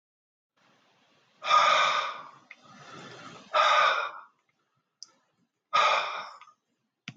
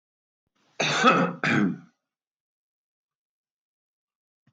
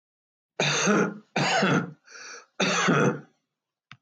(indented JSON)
{
  "exhalation_length": "7.2 s",
  "exhalation_amplitude": 10225,
  "exhalation_signal_mean_std_ratio": 0.42,
  "cough_length": "4.5 s",
  "cough_amplitude": 17224,
  "cough_signal_mean_std_ratio": 0.35,
  "three_cough_length": "4.0 s",
  "three_cough_amplitude": 10565,
  "three_cough_signal_mean_std_ratio": 0.58,
  "survey_phase": "beta (2021-08-13 to 2022-03-07)",
  "age": "65+",
  "gender": "Male",
  "wearing_mask": "No",
  "symptom_none": true,
  "symptom_onset": "6 days",
  "smoker_status": "Ex-smoker",
  "respiratory_condition_asthma": false,
  "respiratory_condition_other": true,
  "recruitment_source": "REACT",
  "submission_delay": "2 days",
  "covid_test_result": "Negative",
  "covid_test_method": "RT-qPCR"
}